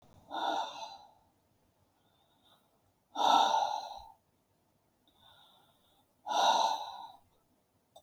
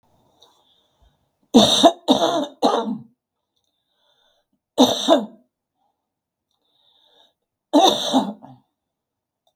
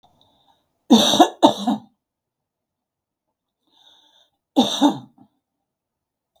{"exhalation_length": "8.0 s", "exhalation_amplitude": 7447, "exhalation_signal_mean_std_ratio": 0.38, "three_cough_length": "9.6 s", "three_cough_amplitude": 32768, "three_cough_signal_mean_std_ratio": 0.34, "cough_length": "6.4 s", "cough_amplitude": 32768, "cough_signal_mean_std_ratio": 0.29, "survey_phase": "beta (2021-08-13 to 2022-03-07)", "age": "65+", "gender": "Female", "wearing_mask": "No", "symptom_none": true, "smoker_status": "Ex-smoker", "respiratory_condition_asthma": false, "respiratory_condition_other": false, "recruitment_source": "REACT", "submission_delay": "2 days", "covid_test_result": "Negative", "covid_test_method": "RT-qPCR", "influenza_a_test_result": "Negative", "influenza_b_test_result": "Negative"}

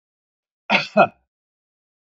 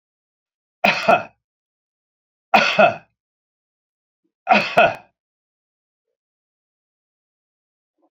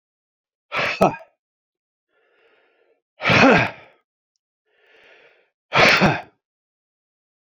{"cough_length": "2.1 s", "cough_amplitude": 27014, "cough_signal_mean_std_ratio": 0.26, "three_cough_length": "8.1 s", "three_cough_amplitude": 32767, "three_cough_signal_mean_std_ratio": 0.27, "exhalation_length": "7.6 s", "exhalation_amplitude": 28014, "exhalation_signal_mean_std_ratio": 0.31, "survey_phase": "beta (2021-08-13 to 2022-03-07)", "age": "65+", "gender": "Male", "wearing_mask": "No", "symptom_none": true, "symptom_onset": "5 days", "smoker_status": "Never smoked", "respiratory_condition_asthma": false, "respiratory_condition_other": false, "recruitment_source": "REACT", "submission_delay": "1 day", "covid_test_result": "Negative", "covid_test_method": "RT-qPCR"}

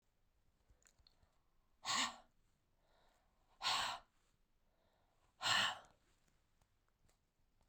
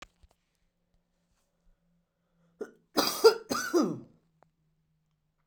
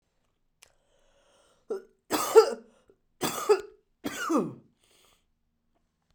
{"exhalation_length": "7.7 s", "exhalation_amplitude": 2146, "exhalation_signal_mean_std_ratio": 0.3, "cough_length": "5.5 s", "cough_amplitude": 14937, "cough_signal_mean_std_ratio": 0.25, "three_cough_length": "6.1 s", "three_cough_amplitude": 20826, "three_cough_signal_mean_std_ratio": 0.28, "survey_phase": "beta (2021-08-13 to 2022-03-07)", "age": "45-64", "gender": "Female", "wearing_mask": "No", "symptom_cough_any": true, "symptom_runny_or_blocked_nose": true, "symptom_sore_throat": true, "symptom_headache": true, "symptom_change_to_sense_of_smell_or_taste": true, "symptom_loss_of_taste": true, "symptom_onset": "3 days", "smoker_status": "Never smoked", "respiratory_condition_asthma": false, "respiratory_condition_other": false, "recruitment_source": "Test and Trace", "submission_delay": "2 days", "covid_test_result": "Positive", "covid_test_method": "RT-qPCR"}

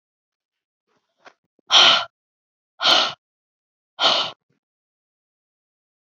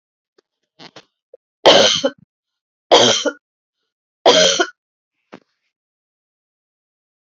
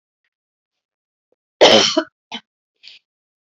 {"exhalation_length": "6.1 s", "exhalation_amplitude": 30115, "exhalation_signal_mean_std_ratio": 0.29, "three_cough_length": "7.3 s", "three_cough_amplitude": 32768, "three_cough_signal_mean_std_ratio": 0.31, "cough_length": "3.4 s", "cough_amplitude": 30506, "cough_signal_mean_std_ratio": 0.26, "survey_phase": "beta (2021-08-13 to 2022-03-07)", "age": "45-64", "gender": "Female", "wearing_mask": "No", "symptom_runny_or_blocked_nose": true, "symptom_fatigue": true, "symptom_headache": true, "symptom_change_to_sense_of_smell_or_taste": true, "symptom_onset": "3 days", "smoker_status": "Never smoked", "respiratory_condition_asthma": false, "respiratory_condition_other": false, "recruitment_source": "Test and Trace", "submission_delay": "1 day", "covid_test_result": "Positive", "covid_test_method": "RT-qPCR", "covid_ct_value": 16.8, "covid_ct_gene": "ORF1ab gene", "covid_ct_mean": 17.8, "covid_viral_load": "1500000 copies/ml", "covid_viral_load_category": "High viral load (>1M copies/ml)"}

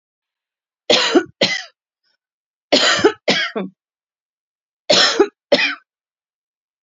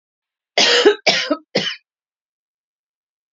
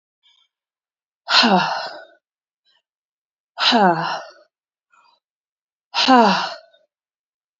{"three_cough_length": "6.8 s", "three_cough_amplitude": 32767, "three_cough_signal_mean_std_ratio": 0.39, "cough_length": "3.3 s", "cough_amplitude": 31227, "cough_signal_mean_std_ratio": 0.38, "exhalation_length": "7.6 s", "exhalation_amplitude": 29326, "exhalation_signal_mean_std_ratio": 0.36, "survey_phase": "beta (2021-08-13 to 2022-03-07)", "age": "18-44", "gender": "Female", "wearing_mask": "No", "symptom_cough_any": true, "symptom_sore_throat": true, "symptom_abdominal_pain": true, "smoker_status": "Ex-smoker", "respiratory_condition_asthma": false, "respiratory_condition_other": false, "recruitment_source": "REACT", "submission_delay": "1 day", "covid_test_result": "Negative", "covid_test_method": "RT-qPCR"}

